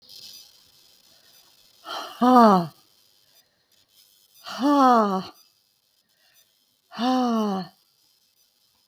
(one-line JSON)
{"exhalation_length": "8.9 s", "exhalation_amplitude": 26661, "exhalation_signal_mean_std_ratio": 0.36, "survey_phase": "beta (2021-08-13 to 2022-03-07)", "age": "65+", "gender": "Female", "wearing_mask": "No", "symptom_cough_any": true, "symptom_shortness_of_breath": true, "symptom_onset": "8 days", "smoker_status": "Current smoker (1 to 10 cigarettes per day)", "respiratory_condition_asthma": false, "respiratory_condition_other": false, "recruitment_source": "REACT", "submission_delay": "1 day", "covid_test_result": "Negative", "covid_test_method": "RT-qPCR"}